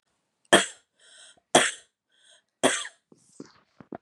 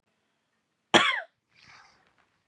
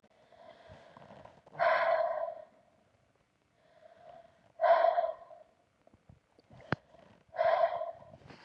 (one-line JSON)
{"three_cough_length": "4.0 s", "three_cough_amplitude": 27419, "three_cough_signal_mean_std_ratio": 0.25, "cough_length": "2.5 s", "cough_amplitude": 20692, "cough_signal_mean_std_ratio": 0.23, "exhalation_length": "8.4 s", "exhalation_amplitude": 7176, "exhalation_signal_mean_std_ratio": 0.4, "survey_phase": "beta (2021-08-13 to 2022-03-07)", "age": "45-64", "gender": "Female", "wearing_mask": "No", "symptom_none": true, "smoker_status": "Never smoked", "respiratory_condition_asthma": false, "respiratory_condition_other": false, "recruitment_source": "REACT", "submission_delay": "1 day", "covid_test_result": "Negative", "covid_test_method": "RT-qPCR", "influenza_a_test_result": "Negative", "influenza_b_test_result": "Negative"}